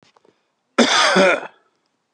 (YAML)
cough_length: 2.1 s
cough_amplitude: 32157
cough_signal_mean_std_ratio: 0.46
survey_phase: beta (2021-08-13 to 2022-03-07)
age: 45-64
gender: Male
wearing_mask: 'No'
symptom_none: true
smoker_status: Ex-smoker
respiratory_condition_asthma: false
respiratory_condition_other: false
recruitment_source: REACT
submission_delay: 2 days
covid_test_result: Negative
covid_test_method: RT-qPCR